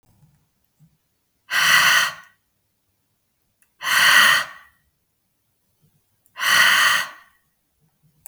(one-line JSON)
{"exhalation_length": "8.3 s", "exhalation_amplitude": 31220, "exhalation_signal_mean_std_ratio": 0.39, "survey_phase": "beta (2021-08-13 to 2022-03-07)", "age": "45-64", "gender": "Female", "wearing_mask": "No", "symptom_none": true, "smoker_status": "Never smoked", "respiratory_condition_asthma": false, "respiratory_condition_other": false, "recruitment_source": "REACT", "submission_delay": "1 day", "covid_test_result": "Negative", "covid_test_method": "RT-qPCR", "influenza_a_test_result": "Negative", "influenza_b_test_result": "Negative"}